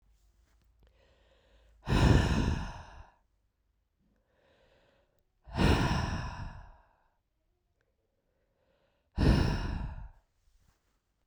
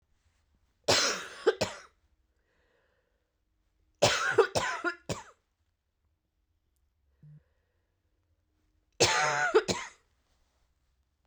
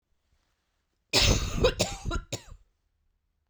{"exhalation_length": "11.3 s", "exhalation_amplitude": 10776, "exhalation_signal_mean_std_ratio": 0.36, "three_cough_length": "11.3 s", "three_cough_amplitude": 11348, "three_cough_signal_mean_std_ratio": 0.33, "cough_length": "3.5 s", "cough_amplitude": 10647, "cough_signal_mean_std_ratio": 0.41, "survey_phase": "beta (2021-08-13 to 2022-03-07)", "age": "18-44", "gender": "Female", "wearing_mask": "No", "symptom_cough_any": true, "symptom_runny_or_blocked_nose": true, "symptom_headache": true, "symptom_change_to_sense_of_smell_or_taste": true, "symptom_loss_of_taste": true, "smoker_status": "Ex-smoker", "respiratory_condition_asthma": false, "respiratory_condition_other": false, "recruitment_source": "Test and Trace", "submission_delay": "2 days", "covid_test_result": "Positive", "covid_test_method": "ePCR"}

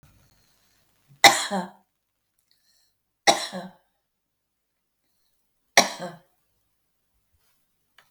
{"three_cough_length": "8.1 s", "three_cough_amplitude": 32766, "three_cough_signal_mean_std_ratio": 0.19, "survey_phase": "beta (2021-08-13 to 2022-03-07)", "age": "65+", "gender": "Female", "wearing_mask": "No", "symptom_none": true, "smoker_status": "Current smoker (e-cigarettes or vapes only)", "respiratory_condition_asthma": false, "respiratory_condition_other": true, "recruitment_source": "REACT", "submission_delay": "1 day", "covid_test_result": "Negative", "covid_test_method": "RT-qPCR"}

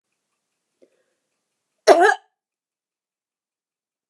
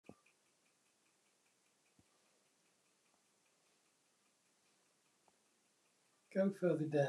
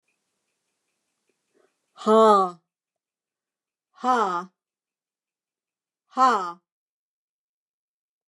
{"cough_length": "4.1 s", "cough_amplitude": 29204, "cough_signal_mean_std_ratio": 0.2, "three_cough_length": "7.1 s", "three_cough_amplitude": 2108, "three_cough_signal_mean_std_ratio": 0.25, "exhalation_length": "8.3 s", "exhalation_amplitude": 18636, "exhalation_signal_mean_std_ratio": 0.28, "survey_phase": "beta (2021-08-13 to 2022-03-07)", "age": "65+", "gender": "Female", "wearing_mask": "No", "symptom_none": true, "smoker_status": "Never smoked", "respiratory_condition_asthma": false, "respiratory_condition_other": false, "recruitment_source": "REACT", "submission_delay": "1 day", "covid_test_result": "Negative", "covid_test_method": "RT-qPCR"}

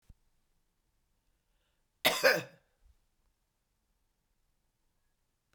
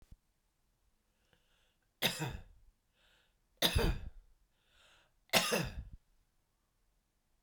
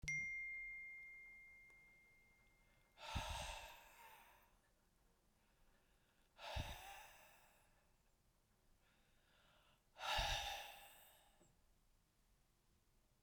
{"cough_length": "5.5 s", "cough_amplitude": 9145, "cough_signal_mean_std_ratio": 0.19, "three_cough_length": "7.4 s", "three_cough_amplitude": 9201, "three_cough_signal_mean_std_ratio": 0.31, "exhalation_length": "13.2 s", "exhalation_amplitude": 1163, "exhalation_signal_mean_std_ratio": 0.46, "survey_phase": "beta (2021-08-13 to 2022-03-07)", "age": "65+", "gender": "Female", "wearing_mask": "No", "symptom_none": true, "smoker_status": "Ex-smoker", "respiratory_condition_asthma": false, "respiratory_condition_other": false, "recruitment_source": "REACT", "submission_delay": "4 days", "covid_test_result": "Negative", "covid_test_method": "RT-qPCR", "influenza_a_test_result": "Unknown/Void", "influenza_b_test_result": "Unknown/Void"}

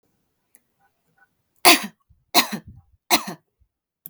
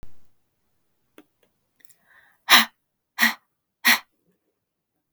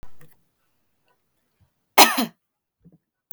{"three_cough_length": "4.1 s", "three_cough_amplitude": 32768, "three_cough_signal_mean_std_ratio": 0.24, "exhalation_length": "5.1 s", "exhalation_amplitude": 32766, "exhalation_signal_mean_std_ratio": 0.23, "cough_length": "3.3 s", "cough_amplitude": 32768, "cough_signal_mean_std_ratio": 0.21, "survey_phase": "beta (2021-08-13 to 2022-03-07)", "age": "18-44", "gender": "Female", "wearing_mask": "No", "symptom_runny_or_blocked_nose": true, "smoker_status": "Ex-smoker", "respiratory_condition_asthma": false, "respiratory_condition_other": false, "recruitment_source": "Test and Trace", "submission_delay": "1 day", "covid_test_result": "Positive", "covid_test_method": "RT-qPCR", "covid_ct_value": 25.0, "covid_ct_gene": "ORF1ab gene"}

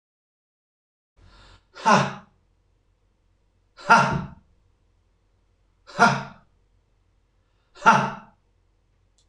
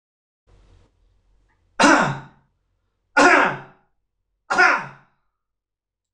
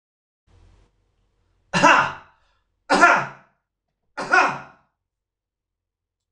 {"exhalation_length": "9.3 s", "exhalation_amplitude": 26027, "exhalation_signal_mean_std_ratio": 0.26, "three_cough_length": "6.1 s", "three_cough_amplitude": 25552, "three_cough_signal_mean_std_ratio": 0.33, "cough_length": "6.3 s", "cough_amplitude": 26028, "cough_signal_mean_std_ratio": 0.31, "survey_phase": "beta (2021-08-13 to 2022-03-07)", "age": "45-64", "gender": "Male", "wearing_mask": "No", "symptom_none": true, "smoker_status": "Never smoked", "respiratory_condition_asthma": false, "respiratory_condition_other": false, "recruitment_source": "REACT", "submission_delay": "1 day", "covid_test_result": "Negative", "covid_test_method": "RT-qPCR", "influenza_a_test_result": "Negative", "influenza_b_test_result": "Negative"}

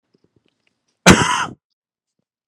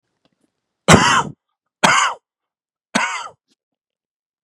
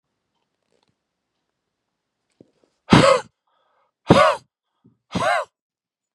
{"cough_length": "2.5 s", "cough_amplitude": 32768, "cough_signal_mean_std_ratio": 0.27, "three_cough_length": "4.4 s", "three_cough_amplitude": 32768, "three_cough_signal_mean_std_ratio": 0.33, "exhalation_length": "6.1 s", "exhalation_amplitude": 32768, "exhalation_signal_mean_std_ratio": 0.27, "survey_phase": "beta (2021-08-13 to 2022-03-07)", "age": "45-64", "gender": "Male", "wearing_mask": "No", "symptom_cough_any": true, "symptom_runny_or_blocked_nose": true, "symptom_fatigue": true, "symptom_change_to_sense_of_smell_or_taste": true, "symptom_other": true, "smoker_status": "Never smoked", "respiratory_condition_asthma": true, "respiratory_condition_other": false, "recruitment_source": "Test and Trace", "submission_delay": "1 day", "covid_test_result": "Positive", "covid_test_method": "RT-qPCR", "covid_ct_value": 27.1, "covid_ct_gene": "ORF1ab gene", "covid_ct_mean": 27.2, "covid_viral_load": "1200 copies/ml", "covid_viral_load_category": "Minimal viral load (< 10K copies/ml)"}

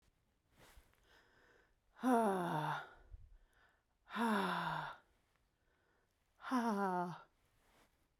{"exhalation_length": "8.2 s", "exhalation_amplitude": 2499, "exhalation_signal_mean_std_ratio": 0.46, "survey_phase": "beta (2021-08-13 to 2022-03-07)", "age": "45-64", "gender": "Female", "wearing_mask": "No", "symptom_cough_any": true, "symptom_fatigue": true, "symptom_fever_high_temperature": true, "symptom_loss_of_taste": true, "symptom_onset": "6 days", "smoker_status": "Ex-smoker", "respiratory_condition_asthma": false, "respiratory_condition_other": false, "recruitment_source": "Test and Trace", "submission_delay": "2 days", "covid_test_result": "Positive", "covid_test_method": "RT-qPCR", "covid_ct_value": 17.6, "covid_ct_gene": "ORF1ab gene", "covid_ct_mean": 18.2, "covid_viral_load": "1100000 copies/ml", "covid_viral_load_category": "High viral load (>1M copies/ml)"}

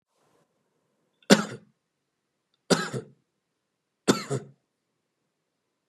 {"three_cough_length": "5.9 s", "three_cough_amplitude": 32147, "three_cough_signal_mean_std_ratio": 0.2, "survey_phase": "beta (2021-08-13 to 2022-03-07)", "age": "18-44", "gender": "Male", "wearing_mask": "No", "symptom_none": true, "smoker_status": "Ex-smoker", "recruitment_source": "Test and Trace", "submission_delay": "4 days", "covid_test_result": "Negative", "covid_test_method": "RT-qPCR"}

